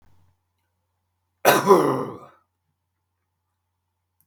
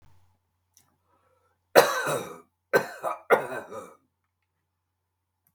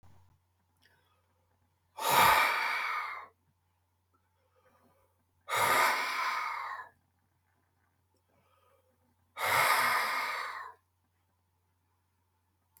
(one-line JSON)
{"cough_length": "4.3 s", "cough_amplitude": 31410, "cough_signal_mean_std_ratio": 0.28, "three_cough_length": "5.5 s", "three_cough_amplitude": 32766, "three_cough_signal_mean_std_ratio": 0.28, "exhalation_length": "12.8 s", "exhalation_amplitude": 10356, "exhalation_signal_mean_std_ratio": 0.42, "survey_phase": "beta (2021-08-13 to 2022-03-07)", "age": "65+", "gender": "Male", "wearing_mask": "No", "symptom_none": true, "smoker_status": "Never smoked", "respiratory_condition_asthma": false, "respiratory_condition_other": false, "recruitment_source": "REACT", "submission_delay": "2 days", "covid_test_result": "Negative", "covid_test_method": "RT-qPCR", "influenza_a_test_result": "Negative", "influenza_b_test_result": "Negative"}